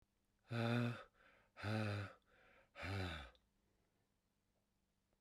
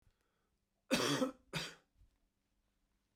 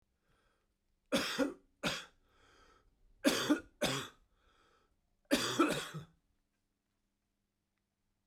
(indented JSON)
{
  "exhalation_length": "5.2 s",
  "exhalation_amplitude": 1474,
  "exhalation_signal_mean_std_ratio": 0.43,
  "cough_length": "3.2 s",
  "cough_amplitude": 3481,
  "cough_signal_mean_std_ratio": 0.33,
  "three_cough_length": "8.3 s",
  "three_cough_amplitude": 5856,
  "three_cough_signal_mean_std_ratio": 0.35,
  "survey_phase": "beta (2021-08-13 to 2022-03-07)",
  "age": "45-64",
  "gender": "Male",
  "wearing_mask": "No",
  "symptom_fatigue": true,
  "symptom_onset": "12 days",
  "smoker_status": "Never smoked",
  "respiratory_condition_asthma": false,
  "respiratory_condition_other": false,
  "recruitment_source": "REACT",
  "submission_delay": "2 days",
  "covid_test_result": "Negative",
  "covid_test_method": "RT-qPCR"
}